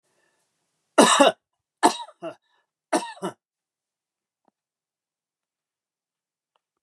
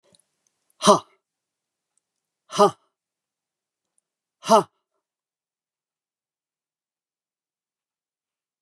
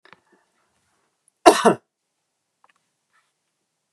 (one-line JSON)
{"three_cough_length": "6.8 s", "three_cough_amplitude": 28805, "three_cough_signal_mean_std_ratio": 0.22, "exhalation_length": "8.6 s", "exhalation_amplitude": 29558, "exhalation_signal_mean_std_ratio": 0.16, "cough_length": "3.9 s", "cough_amplitude": 32768, "cough_signal_mean_std_ratio": 0.17, "survey_phase": "beta (2021-08-13 to 2022-03-07)", "age": "65+", "gender": "Male", "wearing_mask": "No", "symptom_none": true, "smoker_status": "Ex-smoker", "respiratory_condition_asthma": false, "respiratory_condition_other": false, "recruitment_source": "REACT", "submission_delay": "2 days", "covid_test_result": "Negative", "covid_test_method": "RT-qPCR", "influenza_a_test_result": "Negative", "influenza_b_test_result": "Negative"}